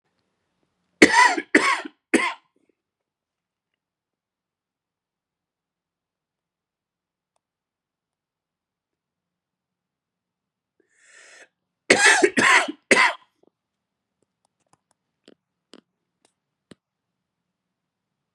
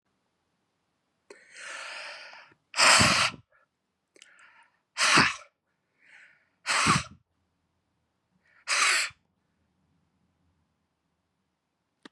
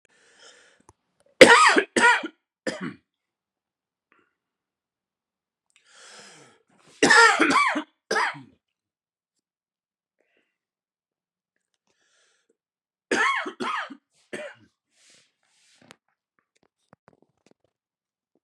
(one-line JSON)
{"cough_length": "18.3 s", "cough_amplitude": 32768, "cough_signal_mean_std_ratio": 0.22, "exhalation_length": "12.1 s", "exhalation_amplitude": 17107, "exhalation_signal_mean_std_ratio": 0.31, "three_cough_length": "18.4 s", "three_cough_amplitude": 32768, "three_cough_signal_mean_std_ratio": 0.25, "survey_phase": "beta (2021-08-13 to 2022-03-07)", "age": "45-64", "gender": "Male", "wearing_mask": "No", "symptom_cough_any": true, "symptom_runny_or_blocked_nose": true, "symptom_sore_throat": true, "symptom_fatigue": true, "symptom_fever_high_temperature": true, "symptom_change_to_sense_of_smell_or_taste": true, "symptom_onset": "2 days", "smoker_status": "Never smoked", "respiratory_condition_asthma": false, "respiratory_condition_other": false, "recruitment_source": "Test and Trace", "submission_delay": "1 day", "covid_test_result": "Positive", "covid_test_method": "RT-qPCR", "covid_ct_value": 16.5, "covid_ct_gene": "ORF1ab gene", "covid_ct_mean": 16.9, "covid_viral_load": "2900000 copies/ml", "covid_viral_load_category": "High viral load (>1M copies/ml)"}